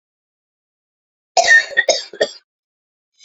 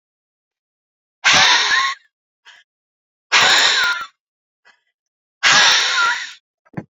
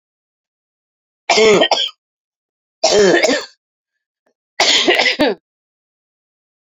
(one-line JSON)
{"cough_length": "3.2 s", "cough_amplitude": 31034, "cough_signal_mean_std_ratio": 0.32, "exhalation_length": "6.9 s", "exhalation_amplitude": 32535, "exhalation_signal_mean_std_ratio": 0.48, "three_cough_length": "6.7 s", "three_cough_amplitude": 31282, "three_cough_signal_mean_std_ratio": 0.43, "survey_phase": "beta (2021-08-13 to 2022-03-07)", "age": "18-44", "gender": "Female", "wearing_mask": "No", "symptom_cough_any": true, "symptom_new_continuous_cough": true, "symptom_runny_or_blocked_nose": true, "symptom_shortness_of_breath": true, "symptom_sore_throat": true, "symptom_diarrhoea": true, "symptom_fatigue": true, "symptom_headache": true, "symptom_change_to_sense_of_smell_or_taste": true, "symptom_loss_of_taste": true, "smoker_status": "Never smoked", "respiratory_condition_asthma": true, "respiratory_condition_other": false, "recruitment_source": "Test and Trace", "submission_delay": "0 days", "covid_test_result": "Positive", "covid_test_method": "LFT"}